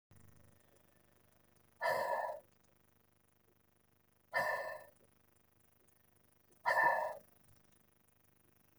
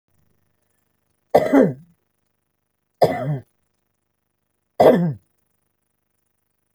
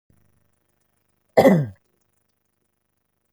{"exhalation_length": "8.8 s", "exhalation_amplitude": 3367, "exhalation_signal_mean_std_ratio": 0.34, "three_cough_length": "6.7 s", "three_cough_amplitude": 30713, "three_cough_signal_mean_std_ratio": 0.29, "cough_length": "3.3 s", "cough_amplitude": 27122, "cough_signal_mean_std_ratio": 0.23, "survey_phase": "alpha (2021-03-01 to 2021-08-12)", "age": "65+", "gender": "Female", "wearing_mask": "No", "symptom_cough_any": true, "symptom_onset": "8 days", "smoker_status": "Never smoked", "respiratory_condition_asthma": false, "respiratory_condition_other": false, "recruitment_source": "REACT", "submission_delay": "2 days", "covid_test_result": "Negative", "covid_test_method": "RT-qPCR"}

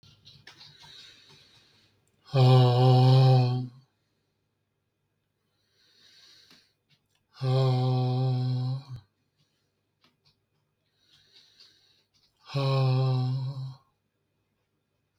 {"exhalation_length": "15.2 s", "exhalation_amplitude": 13283, "exhalation_signal_mean_std_ratio": 0.44, "survey_phase": "beta (2021-08-13 to 2022-03-07)", "age": "45-64", "gender": "Male", "wearing_mask": "No", "symptom_none": true, "smoker_status": "Never smoked", "respiratory_condition_asthma": true, "respiratory_condition_other": false, "recruitment_source": "REACT", "submission_delay": "1 day", "covid_test_result": "Negative", "covid_test_method": "RT-qPCR", "influenza_a_test_result": "Negative", "influenza_b_test_result": "Negative"}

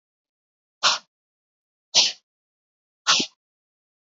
{"exhalation_length": "4.0 s", "exhalation_amplitude": 22624, "exhalation_signal_mean_std_ratio": 0.26, "survey_phase": "alpha (2021-03-01 to 2021-08-12)", "age": "45-64", "gender": "Male", "wearing_mask": "No", "symptom_headache": true, "smoker_status": "Never smoked", "respiratory_condition_asthma": false, "respiratory_condition_other": false, "recruitment_source": "REACT", "submission_delay": "1 day", "covid_test_result": "Negative", "covid_test_method": "RT-qPCR"}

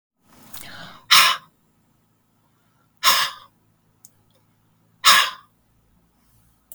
{"exhalation_length": "6.7 s", "exhalation_amplitude": 32768, "exhalation_signal_mean_std_ratio": 0.27, "survey_phase": "beta (2021-08-13 to 2022-03-07)", "age": "45-64", "gender": "Male", "wearing_mask": "No", "symptom_cough_any": true, "symptom_shortness_of_breath": true, "symptom_fatigue": true, "symptom_onset": "12 days", "smoker_status": "Ex-smoker", "respiratory_condition_asthma": true, "respiratory_condition_other": false, "recruitment_source": "REACT", "submission_delay": "3 days", "covid_test_result": "Negative", "covid_test_method": "RT-qPCR", "covid_ct_value": 37.2, "covid_ct_gene": "N gene", "influenza_a_test_result": "Negative", "influenza_b_test_result": "Negative"}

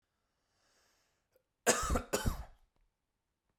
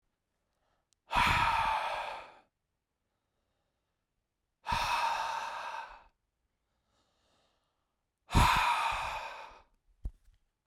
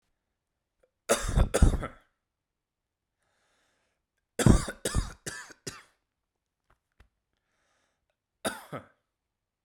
{"cough_length": "3.6 s", "cough_amplitude": 6818, "cough_signal_mean_std_ratio": 0.31, "exhalation_length": "10.7 s", "exhalation_amplitude": 7558, "exhalation_signal_mean_std_ratio": 0.43, "three_cough_length": "9.6 s", "three_cough_amplitude": 17932, "three_cough_signal_mean_std_ratio": 0.25, "survey_phase": "beta (2021-08-13 to 2022-03-07)", "age": "18-44", "gender": "Male", "wearing_mask": "No", "symptom_cough_any": true, "symptom_runny_or_blocked_nose": true, "symptom_sore_throat": true, "symptom_fatigue": true, "symptom_headache": true, "smoker_status": "Never smoked", "respiratory_condition_asthma": false, "respiratory_condition_other": false, "recruitment_source": "Test and Trace", "submission_delay": "2 days", "covid_test_result": "Positive", "covid_test_method": "RT-qPCR"}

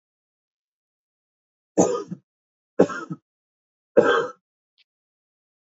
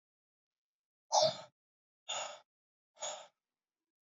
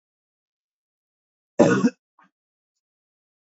{"three_cough_length": "5.6 s", "three_cough_amplitude": 26942, "three_cough_signal_mean_std_ratio": 0.26, "exhalation_length": "4.1 s", "exhalation_amplitude": 4671, "exhalation_signal_mean_std_ratio": 0.26, "cough_length": "3.6 s", "cough_amplitude": 26962, "cough_signal_mean_std_ratio": 0.22, "survey_phase": "beta (2021-08-13 to 2022-03-07)", "age": "18-44", "gender": "Male", "wearing_mask": "No", "symptom_cough_any": true, "symptom_runny_or_blocked_nose": true, "symptom_sore_throat": true, "symptom_fatigue": true, "symptom_headache": true, "smoker_status": "Never smoked", "respiratory_condition_asthma": false, "respiratory_condition_other": false, "recruitment_source": "Test and Trace", "submission_delay": "2 days", "covid_test_result": "Positive", "covid_test_method": "LFT"}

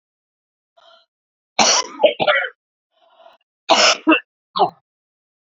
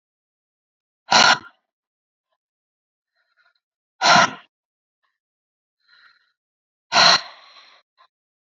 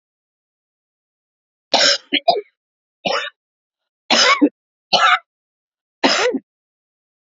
{"cough_length": "5.5 s", "cough_amplitude": 30329, "cough_signal_mean_std_ratio": 0.36, "exhalation_length": "8.4 s", "exhalation_amplitude": 32767, "exhalation_signal_mean_std_ratio": 0.25, "three_cough_length": "7.3 s", "three_cough_amplitude": 32768, "three_cough_signal_mean_std_ratio": 0.36, "survey_phase": "beta (2021-08-13 to 2022-03-07)", "age": "65+", "gender": "Female", "wearing_mask": "No", "symptom_none": true, "smoker_status": "Never smoked", "respiratory_condition_asthma": false, "respiratory_condition_other": false, "recruitment_source": "REACT", "submission_delay": "1 day", "covid_test_result": "Negative", "covid_test_method": "RT-qPCR", "influenza_a_test_result": "Negative", "influenza_b_test_result": "Negative"}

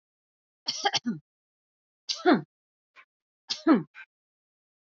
{"three_cough_length": "4.9 s", "three_cough_amplitude": 12129, "three_cough_signal_mean_std_ratio": 0.28, "survey_phase": "alpha (2021-03-01 to 2021-08-12)", "age": "45-64", "gender": "Female", "wearing_mask": "No", "symptom_none": true, "smoker_status": "Never smoked", "respiratory_condition_asthma": false, "respiratory_condition_other": false, "recruitment_source": "REACT", "submission_delay": "2 days", "covid_test_result": "Negative", "covid_test_method": "RT-qPCR"}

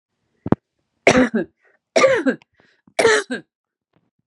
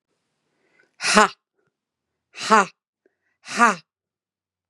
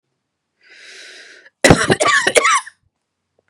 {"three_cough_length": "4.3 s", "three_cough_amplitude": 32767, "three_cough_signal_mean_std_ratio": 0.37, "exhalation_length": "4.7 s", "exhalation_amplitude": 32767, "exhalation_signal_mean_std_ratio": 0.25, "cough_length": "3.5 s", "cough_amplitude": 32768, "cough_signal_mean_std_ratio": 0.39, "survey_phase": "beta (2021-08-13 to 2022-03-07)", "age": "18-44", "gender": "Male", "wearing_mask": "No", "symptom_none": true, "symptom_onset": "3 days", "smoker_status": "Ex-smoker", "respiratory_condition_asthma": false, "respiratory_condition_other": false, "recruitment_source": "Test and Trace", "submission_delay": "1 day", "covid_test_result": "Positive", "covid_test_method": "RT-qPCR", "covid_ct_value": 13.5, "covid_ct_gene": "ORF1ab gene"}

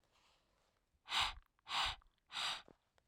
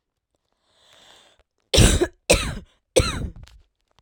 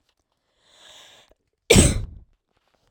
{"exhalation_length": "3.1 s", "exhalation_amplitude": 2157, "exhalation_signal_mean_std_ratio": 0.41, "three_cough_length": "4.0 s", "three_cough_amplitude": 30201, "three_cough_signal_mean_std_ratio": 0.34, "cough_length": "2.9 s", "cough_amplitude": 32767, "cough_signal_mean_std_ratio": 0.26, "survey_phase": "beta (2021-08-13 to 2022-03-07)", "age": "18-44", "gender": "Female", "wearing_mask": "No", "symptom_cough_any": true, "symptom_runny_or_blocked_nose": true, "symptom_onset": "4 days", "smoker_status": "Never smoked", "respiratory_condition_asthma": false, "respiratory_condition_other": false, "recruitment_source": "Test and Trace", "submission_delay": "1 day", "covid_test_result": "Positive", "covid_test_method": "RT-qPCR", "covid_ct_value": 21.1, "covid_ct_gene": "ORF1ab gene", "covid_ct_mean": 21.2, "covid_viral_load": "110000 copies/ml", "covid_viral_load_category": "Low viral load (10K-1M copies/ml)"}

